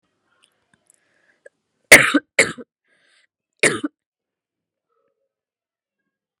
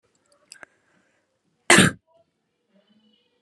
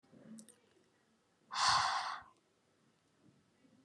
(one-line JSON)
{"three_cough_length": "6.4 s", "three_cough_amplitude": 32768, "three_cough_signal_mean_std_ratio": 0.19, "cough_length": "3.4 s", "cough_amplitude": 32494, "cough_signal_mean_std_ratio": 0.19, "exhalation_length": "3.8 s", "exhalation_amplitude": 4517, "exhalation_signal_mean_std_ratio": 0.35, "survey_phase": "beta (2021-08-13 to 2022-03-07)", "age": "18-44", "gender": "Female", "wearing_mask": "No", "symptom_cough_any": true, "symptom_sore_throat": true, "symptom_fatigue": true, "symptom_headache": true, "symptom_onset": "12 days", "smoker_status": "Ex-smoker", "respiratory_condition_asthma": true, "respiratory_condition_other": false, "recruitment_source": "REACT", "submission_delay": "1 day", "covid_test_result": "Negative", "covid_test_method": "RT-qPCR"}